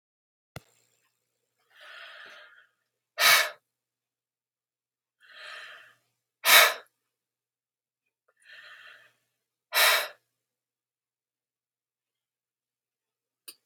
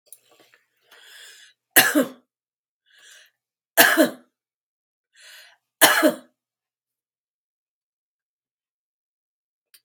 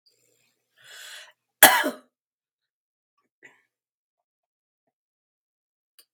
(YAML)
exhalation_length: 13.7 s
exhalation_amplitude: 29832
exhalation_signal_mean_std_ratio: 0.21
three_cough_length: 9.8 s
three_cough_amplitude: 32768
three_cough_signal_mean_std_ratio: 0.23
cough_length: 6.1 s
cough_amplitude: 32768
cough_signal_mean_std_ratio: 0.15
survey_phase: beta (2021-08-13 to 2022-03-07)
age: 65+
gender: Female
wearing_mask: 'No'
symptom_none: true
smoker_status: Ex-smoker
respiratory_condition_asthma: false
respiratory_condition_other: false
recruitment_source: REACT
submission_delay: 2 days
covid_test_result: Negative
covid_test_method: RT-qPCR